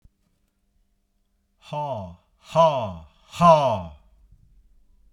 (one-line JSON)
{"exhalation_length": "5.1 s", "exhalation_amplitude": 22843, "exhalation_signal_mean_std_ratio": 0.34, "survey_phase": "beta (2021-08-13 to 2022-03-07)", "age": "45-64", "gender": "Male", "wearing_mask": "No", "symptom_none": true, "smoker_status": "Never smoked", "respiratory_condition_asthma": false, "respiratory_condition_other": false, "recruitment_source": "REACT", "submission_delay": "1 day", "covid_test_result": "Negative", "covid_test_method": "RT-qPCR"}